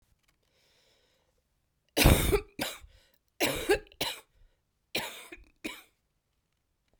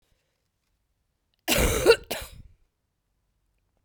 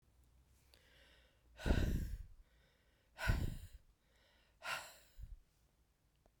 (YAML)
three_cough_length: 7.0 s
three_cough_amplitude: 18272
three_cough_signal_mean_std_ratio: 0.3
cough_length: 3.8 s
cough_amplitude: 18486
cough_signal_mean_std_ratio: 0.28
exhalation_length: 6.4 s
exhalation_amplitude: 2582
exhalation_signal_mean_std_ratio: 0.37
survey_phase: beta (2021-08-13 to 2022-03-07)
age: 45-64
gender: Female
wearing_mask: 'No'
symptom_cough_any: true
symptom_runny_or_blocked_nose: true
symptom_shortness_of_breath: true
symptom_fatigue: true
symptom_headache: true
symptom_change_to_sense_of_smell_or_taste: true
symptom_onset: 4 days
smoker_status: Never smoked
respiratory_condition_asthma: true
respiratory_condition_other: false
recruitment_source: Test and Trace
submission_delay: 2 days
covid_test_result: Positive
covid_test_method: RT-qPCR